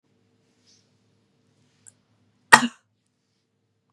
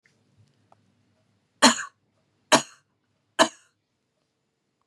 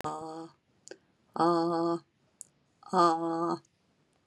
{"cough_length": "3.9 s", "cough_amplitude": 32768, "cough_signal_mean_std_ratio": 0.12, "three_cough_length": "4.9 s", "three_cough_amplitude": 28377, "three_cough_signal_mean_std_ratio": 0.19, "exhalation_length": "4.3 s", "exhalation_amplitude": 9191, "exhalation_signal_mean_std_ratio": 0.48, "survey_phase": "beta (2021-08-13 to 2022-03-07)", "age": "45-64", "gender": "Female", "wearing_mask": "No", "symptom_none": true, "smoker_status": "Never smoked", "respiratory_condition_asthma": false, "respiratory_condition_other": false, "recruitment_source": "REACT", "submission_delay": "2 days", "covid_test_result": "Negative", "covid_test_method": "RT-qPCR", "influenza_a_test_result": "Negative", "influenza_b_test_result": "Negative"}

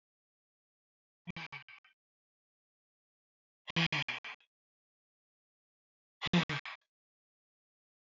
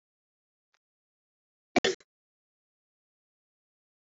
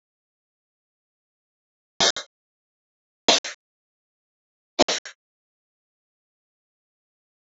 {"exhalation_length": "8.0 s", "exhalation_amplitude": 4462, "exhalation_signal_mean_std_ratio": 0.23, "cough_length": "4.2 s", "cough_amplitude": 10357, "cough_signal_mean_std_ratio": 0.12, "three_cough_length": "7.6 s", "three_cough_amplitude": 29822, "three_cough_signal_mean_std_ratio": 0.17, "survey_phase": "alpha (2021-03-01 to 2021-08-12)", "age": "45-64", "gender": "Female", "wearing_mask": "No", "symptom_none": true, "smoker_status": "Current smoker (1 to 10 cigarettes per day)", "respiratory_condition_asthma": false, "respiratory_condition_other": false, "recruitment_source": "Test and Trace", "submission_delay": "2 days", "covid_test_result": "Positive", "covid_test_method": "RT-qPCR", "covid_ct_value": 16.9, "covid_ct_gene": "ORF1ab gene", "covid_ct_mean": 17.1, "covid_viral_load": "2400000 copies/ml", "covid_viral_load_category": "High viral load (>1M copies/ml)"}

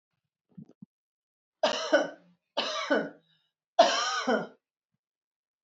{"three_cough_length": "5.6 s", "three_cough_amplitude": 14483, "three_cough_signal_mean_std_ratio": 0.37, "survey_phase": "beta (2021-08-13 to 2022-03-07)", "age": "45-64", "gender": "Female", "wearing_mask": "No", "symptom_none": true, "smoker_status": "Never smoked", "respiratory_condition_asthma": true, "respiratory_condition_other": false, "recruitment_source": "REACT", "submission_delay": "1 day", "covid_test_result": "Negative", "covid_test_method": "RT-qPCR"}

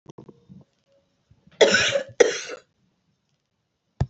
{"cough_length": "4.1 s", "cough_amplitude": 28430, "cough_signal_mean_std_ratio": 0.29, "survey_phase": "alpha (2021-03-01 to 2021-08-12)", "age": "45-64", "gender": "Female", "wearing_mask": "No", "symptom_none": true, "smoker_status": "Never smoked", "respiratory_condition_asthma": false, "respiratory_condition_other": false, "recruitment_source": "REACT", "submission_delay": "1 day", "covid_test_result": "Negative", "covid_test_method": "RT-qPCR"}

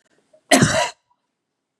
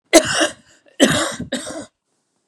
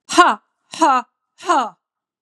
{"cough_length": "1.8 s", "cough_amplitude": 32767, "cough_signal_mean_std_ratio": 0.35, "three_cough_length": "2.5 s", "three_cough_amplitude": 32768, "three_cough_signal_mean_std_ratio": 0.42, "exhalation_length": "2.2 s", "exhalation_amplitude": 32767, "exhalation_signal_mean_std_ratio": 0.44, "survey_phase": "beta (2021-08-13 to 2022-03-07)", "age": "45-64", "gender": "Male", "wearing_mask": "No", "symptom_sore_throat": true, "symptom_fatigue": true, "symptom_headache": true, "smoker_status": "Never smoked", "respiratory_condition_asthma": false, "respiratory_condition_other": false, "recruitment_source": "Test and Trace", "submission_delay": "1 day", "covid_test_result": "Negative", "covid_test_method": "RT-qPCR"}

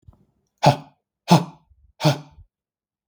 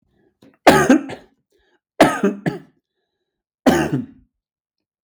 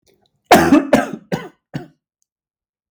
{"exhalation_length": "3.1 s", "exhalation_amplitude": 32766, "exhalation_signal_mean_std_ratio": 0.27, "three_cough_length": "5.0 s", "three_cough_amplitude": 32768, "three_cough_signal_mean_std_ratio": 0.35, "cough_length": "2.9 s", "cough_amplitude": 32768, "cough_signal_mean_std_ratio": 0.35, "survey_phase": "beta (2021-08-13 to 2022-03-07)", "age": "45-64", "gender": "Male", "wearing_mask": "No", "symptom_cough_any": true, "symptom_onset": "12 days", "smoker_status": "Never smoked", "respiratory_condition_asthma": false, "respiratory_condition_other": false, "recruitment_source": "REACT", "submission_delay": "2 days", "covid_test_result": "Negative", "covid_test_method": "RT-qPCR", "influenza_a_test_result": "Negative", "influenza_b_test_result": "Negative"}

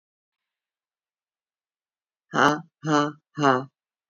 {"exhalation_length": "4.1 s", "exhalation_amplitude": 21983, "exhalation_signal_mean_std_ratio": 0.3, "survey_phase": "beta (2021-08-13 to 2022-03-07)", "age": "45-64", "gender": "Female", "wearing_mask": "No", "symptom_cough_any": true, "symptom_runny_or_blocked_nose": true, "symptom_sore_throat": true, "symptom_abdominal_pain": true, "symptom_onset": "4 days", "smoker_status": "Current smoker (1 to 10 cigarettes per day)", "respiratory_condition_asthma": true, "respiratory_condition_other": false, "recruitment_source": "Test and Trace", "submission_delay": "2 days", "covid_test_result": "Positive", "covid_test_method": "RT-qPCR", "covid_ct_value": 28.5, "covid_ct_gene": "N gene"}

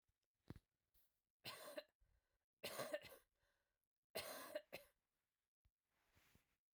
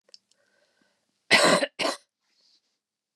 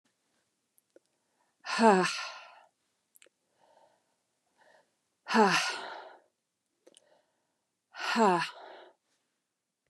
{"three_cough_length": "6.7 s", "three_cough_amplitude": 619, "three_cough_signal_mean_std_ratio": 0.35, "cough_length": "3.2 s", "cough_amplitude": 19661, "cough_signal_mean_std_ratio": 0.3, "exhalation_length": "9.9 s", "exhalation_amplitude": 13749, "exhalation_signal_mean_std_ratio": 0.28, "survey_phase": "beta (2021-08-13 to 2022-03-07)", "age": "45-64", "gender": "Female", "wearing_mask": "No", "symptom_cough_any": true, "symptom_fatigue": true, "symptom_other": true, "symptom_onset": "6 days", "smoker_status": "Never smoked", "respiratory_condition_asthma": false, "respiratory_condition_other": false, "recruitment_source": "Test and Trace", "submission_delay": "2 days", "covid_test_result": "Positive", "covid_test_method": "RT-qPCR", "covid_ct_value": 16.8, "covid_ct_gene": "ORF1ab gene", "covid_ct_mean": 17.6, "covid_viral_load": "1700000 copies/ml", "covid_viral_load_category": "High viral load (>1M copies/ml)"}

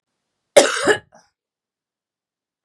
{"cough_length": "2.6 s", "cough_amplitude": 32768, "cough_signal_mean_std_ratio": 0.25, "survey_phase": "beta (2021-08-13 to 2022-03-07)", "age": "45-64", "gender": "Female", "wearing_mask": "No", "symptom_cough_any": true, "symptom_runny_or_blocked_nose": true, "smoker_status": "Ex-smoker", "respiratory_condition_asthma": false, "respiratory_condition_other": false, "recruitment_source": "Test and Trace", "submission_delay": "1 day", "covid_test_result": "Positive", "covid_test_method": "RT-qPCR"}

